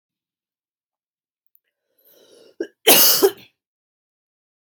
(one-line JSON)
{"cough_length": "4.7 s", "cough_amplitude": 32768, "cough_signal_mean_std_ratio": 0.24, "survey_phase": "beta (2021-08-13 to 2022-03-07)", "age": "18-44", "gender": "Female", "wearing_mask": "No", "symptom_cough_any": true, "symptom_runny_or_blocked_nose": true, "symptom_onset": "3 days", "smoker_status": "Ex-smoker", "respiratory_condition_asthma": true, "respiratory_condition_other": false, "recruitment_source": "Test and Trace", "submission_delay": "2 days", "covid_test_result": "Positive", "covid_test_method": "RT-qPCR", "covid_ct_value": 30.7, "covid_ct_gene": "ORF1ab gene"}